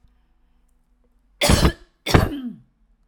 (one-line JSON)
{"cough_length": "3.1 s", "cough_amplitude": 32767, "cough_signal_mean_std_ratio": 0.34, "survey_phase": "alpha (2021-03-01 to 2021-08-12)", "age": "45-64", "gender": "Female", "wearing_mask": "No", "symptom_none": true, "smoker_status": "Never smoked", "respiratory_condition_asthma": false, "respiratory_condition_other": false, "recruitment_source": "REACT", "submission_delay": "2 days", "covid_test_result": "Negative", "covid_test_method": "RT-qPCR"}